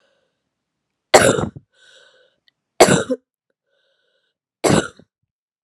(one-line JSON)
{"three_cough_length": "5.6 s", "three_cough_amplitude": 32768, "three_cough_signal_mean_std_ratio": 0.27, "survey_phase": "beta (2021-08-13 to 2022-03-07)", "age": "18-44", "gender": "Female", "wearing_mask": "No", "symptom_cough_any": true, "symptom_runny_or_blocked_nose": true, "symptom_headache": true, "symptom_onset": "8 days", "smoker_status": "Never smoked", "respiratory_condition_asthma": false, "respiratory_condition_other": false, "recruitment_source": "Test and Trace", "submission_delay": "2 days", "covid_test_result": "Positive", "covid_test_method": "RT-qPCR"}